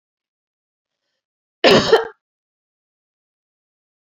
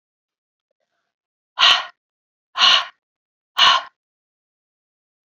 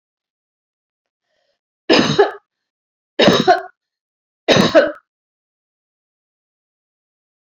{"cough_length": "4.1 s", "cough_amplitude": 29994, "cough_signal_mean_std_ratio": 0.23, "exhalation_length": "5.3 s", "exhalation_amplitude": 30757, "exhalation_signal_mean_std_ratio": 0.29, "three_cough_length": "7.4 s", "three_cough_amplitude": 32767, "three_cough_signal_mean_std_ratio": 0.3, "survey_phase": "beta (2021-08-13 to 2022-03-07)", "age": "65+", "gender": "Female", "wearing_mask": "No", "symptom_none": true, "smoker_status": "Never smoked", "respiratory_condition_asthma": false, "respiratory_condition_other": false, "recruitment_source": "REACT", "submission_delay": "1 day", "covid_test_result": "Negative", "covid_test_method": "RT-qPCR"}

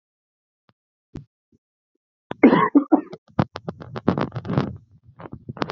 {"cough_length": "5.7 s", "cough_amplitude": 30099, "cough_signal_mean_std_ratio": 0.31, "survey_phase": "beta (2021-08-13 to 2022-03-07)", "age": "45-64", "gender": "Male", "wearing_mask": "No", "symptom_cough_any": true, "symptom_runny_or_blocked_nose": true, "symptom_diarrhoea": true, "symptom_fever_high_temperature": true, "symptom_headache": true, "symptom_change_to_sense_of_smell_or_taste": true, "symptom_loss_of_taste": true, "symptom_onset": "3 days", "smoker_status": "Ex-smoker", "respiratory_condition_asthma": false, "respiratory_condition_other": false, "recruitment_source": "Test and Trace", "submission_delay": "2 days", "covid_test_result": "Positive", "covid_test_method": "RT-qPCR", "covid_ct_value": 20.7, "covid_ct_gene": "ORF1ab gene"}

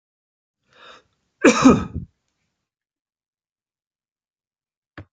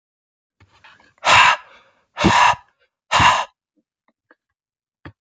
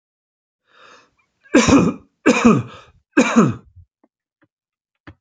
{"cough_length": "5.1 s", "cough_amplitude": 32581, "cough_signal_mean_std_ratio": 0.21, "exhalation_length": "5.2 s", "exhalation_amplitude": 29000, "exhalation_signal_mean_std_ratio": 0.36, "three_cough_length": "5.2 s", "three_cough_amplitude": 31344, "three_cough_signal_mean_std_ratio": 0.37, "survey_phase": "beta (2021-08-13 to 2022-03-07)", "age": "45-64", "gender": "Male", "wearing_mask": "No", "symptom_none": true, "smoker_status": "Ex-smoker", "respiratory_condition_asthma": false, "respiratory_condition_other": false, "recruitment_source": "REACT", "submission_delay": "1 day", "covid_test_result": "Negative", "covid_test_method": "RT-qPCR"}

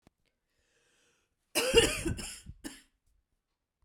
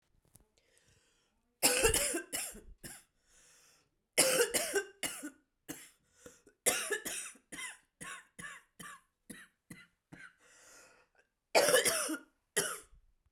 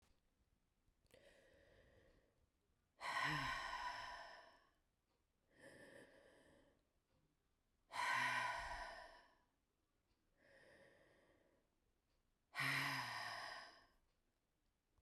{"cough_length": "3.8 s", "cough_amplitude": 11674, "cough_signal_mean_std_ratio": 0.3, "three_cough_length": "13.3 s", "three_cough_amplitude": 9259, "three_cough_signal_mean_std_ratio": 0.38, "exhalation_length": "15.0 s", "exhalation_amplitude": 1133, "exhalation_signal_mean_std_ratio": 0.42, "survey_phase": "beta (2021-08-13 to 2022-03-07)", "age": "18-44", "gender": "Female", "wearing_mask": "No", "symptom_cough_any": true, "symptom_runny_or_blocked_nose": true, "symptom_shortness_of_breath": true, "symptom_fatigue": true, "symptom_change_to_sense_of_smell_or_taste": true, "smoker_status": "Ex-smoker", "respiratory_condition_asthma": false, "respiratory_condition_other": false, "recruitment_source": "Test and Trace", "submission_delay": "2 days", "covid_test_result": "Positive", "covid_test_method": "RT-qPCR", "covid_ct_value": 12.8, "covid_ct_gene": "ORF1ab gene"}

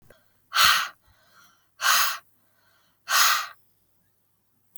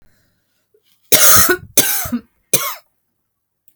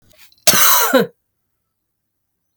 {"exhalation_length": "4.8 s", "exhalation_amplitude": 22347, "exhalation_signal_mean_std_ratio": 0.38, "three_cough_length": "3.8 s", "three_cough_amplitude": 32768, "three_cough_signal_mean_std_ratio": 0.38, "cough_length": "2.6 s", "cough_amplitude": 32768, "cough_signal_mean_std_ratio": 0.39, "survey_phase": "alpha (2021-03-01 to 2021-08-12)", "age": "45-64", "gender": "Female", "wearing_mask": "No", "symptom_cough_any": true, "symptom_headache": true, "symptom_onset": "2 days", "smoker_status": "Ex-smoker", "respiratory_condition_asthma": false, "respiratory_condition_other": false, "recruitment_source": "Test and Trace", "submission_delay": "1 day", "covid_test_result": "Positive", "covid_test_method": "RT-qPCR", "covid_ct_value": 18.3, "covid_ct_gene": "S gene", "covid_ct_mean": 19.5, "covid_viral_load": "390000 copies/ml", "covid_viral_load_category": "Low viral load (10K-1M copies/ml)"}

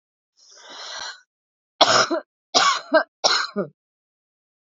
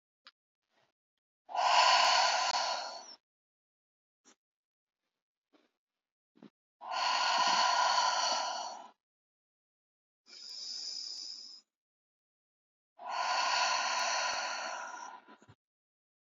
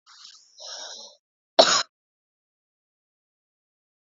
{"three_cough_length": "4.8 s", "three_cough_amplitude": 30508, "three_cough_signal_mean_std_ratio": 0.38, "exhalation_length": "16.2 s", "exhalation_amplitude": 6657, "exhalation_signal_mean_std_ratio": 0.49, "cough_length": "4.0 s", "cough_amplitude": 30190, "cough_signal_mean_std_ratio": 0.2, "survey_phase": "beta (2021-08-13 to 2022-03-07)", "age": "18-44", "gender": "Female", "wearing_mask": "No", "symptom_runny_or_blocked_nose": true, "symptom_change_to_sense_of_smell_or_taste": true, "symptom_loss_of_taste": true, "symptom_onset": "8 days", "smoker_status": "Never smoked", "respiratory_condition_asthma": false, "respiratory_condition_other": false, "recruitment_source": "Test and Trace", "submission_delay": "1 day", "covid_test_result": "Positive", "covid_test_method": "RT-qPCR", "covid_ct_value": 24.6, "covid_ct_gene": "S gene", "covid_ct_mean": 25.3, "covid_viral_load": "5100 copies/ml", "covid_viral_load_category": "Minimal viral load (< 10K copies/ml)"}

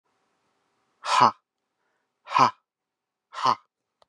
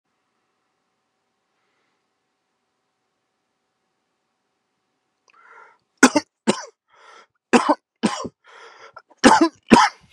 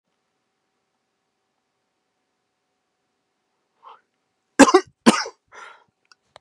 {"exhalation_length": "4.1 s", "exhalation_amplitude": 21550, "exhalation_signal_mean_std_ratio": 0.27, "three_cough_length": "10.1 s", "three_cough_amplitude": 32768, "three_cough_signal_mean_std_ratio": 0.23, "cough_length": "6.4 s", "cough_amplitude": 32768, "cough_signal_mean_std_ratio": 0.16, "survey_phase": "beta (2021-08-13 to 2022-03-07)", "age": "45-64", "gender": "Male", "wearing_mask": "No", "symptom_cough_any": true, "symptom_abdominal_pain": true, "symptom_fatigue": true, "symptom_headache": true, "smoker_status": "Current smoker (1 to 10 cigarettes per day)", "respiratory_condition_asthma": false, "respiratory_condition_other": false, "recruitment_source": "REACT", "submission_delay": "6 days", "covid_test_result": "Negative", "covid_test_method": "RT-qPCR", "influenza_a_test_result": "Negative", "influenza_b_test_result": "Negative"}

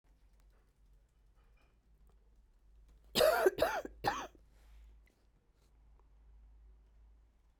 {"three_cough_length": "7.6 s", "three_cough_amplitude": 5268, "three_cough_signal_mean_std_ratio": 0.29, "survey_phase": "beta (2021-08-13 to 2022-03-07)", "age": "45-64", "gender": "Female", "wearing_mask": "No", "symptom_cough_any": true, "symptom_runny_or_blocked_nose": true, "symptom_shortness_of_breath": true, "symptom_abdominal_pain": true, "symptom_fatigue": true, "symptom_fever_high_temperature": true, "symptom_headache": true, "symptom_change_to_sense_of_smell_or_taste": true, "symptom_other": true, "symptom_onset": "4 days", "smoker_status": "Never smoked", "respiratory_condition_asthma": false, "respiratory_condition_other": false, "recruitment_source": "Test and Trace", "submission_delay": "2 days", "covid_test_result": "Positive", "covid_test_method": "RT-qPCR", "covid_ct_value": 20.6, "covid_ct_gene": "ORF1ab gene"}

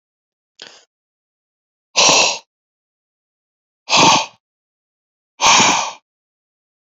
{"exhalation_length": "7.0 s", "exhalation_amplitude": 32425, "exhalation_signal_mean_std_ratio": 0.34, "survey_phase": "beta (2021-08-13 to 2022-03-07)", "age": "18-44", "gender": "Male", "wearing_mask": "No", "symptom_none": true, "smoker_status": "Never smoked", "respiratory_condition_asthma": false, "respiratory_condition_other": false, "recruitment_source": "REACT", "submission_delay": "1 day", "covid_test_result": "Negative", "covid_test_method": "RT-qPCR", "influenza_a_test_result": "Negative", "influenza_b_test_result": "Negative"}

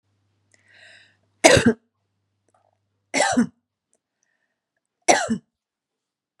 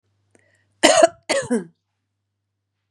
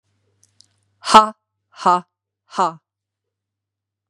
{"three_cough_length": "6.4 s", "three_cough_amplitude": 32768, "three_cough_signal_mean_std_ratio": 0.26, "cough_length": "2.9 s", "cough_amplitude": 32768, "cough_signal_mean_std_ratio": 0.3, "exhalation_length": "4.1 s", "exhalation_amplitude": 32768, "exhalation_signal_mean_std_ratio": 0.23, "survey_phase": "beta (2021-08-13 to 2022-03-07)", "age": "45-64", "gender": "Female", "wearing_mask": "No", "symptom_none": true, "smoker_status": "Never smoked", "respiratory_condition_asthma": false, "respiratory_condition_other": false, "recruitment_source": "REACT", "submission_delay": "1 day", "covid_test_result": "Negative", "covid_test_method": "RT-qPCR", "influenza_a_test_result": "Negative", "influenza_b_test_result": "Negative"}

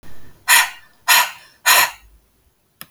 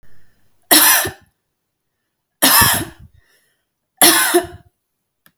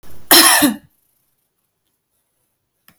{"exhalation_length": "2.9 s", "exhalation_amplitude": 32768, "exhalation_signal_mean_std_ratio": 0.42, "three_cough_length": "5.4 s", "three_cough_amplitude": 32768, "three_cough_signal_mean_std_ratio": 0.39, "cough_length": "3.0 s", "cough_amplitude": 32768, "cough_signal_mean_std_ratio": 0.34, "survey_phase": "beta (2021-08-13 to 2022-03-07)", "age": "45-64", "gender": "Female", "wearing_mask": "No", "symptom_none": true, "smoker_status": "Ex-smoker", "respiratory_condition_asthma": false, "respiratory_condition_other": false, "recruitment_source": "REACT", "submission_delay": "2 days", "covid_test_result": "Negative", "covid_test_method": "RT-qPCR"}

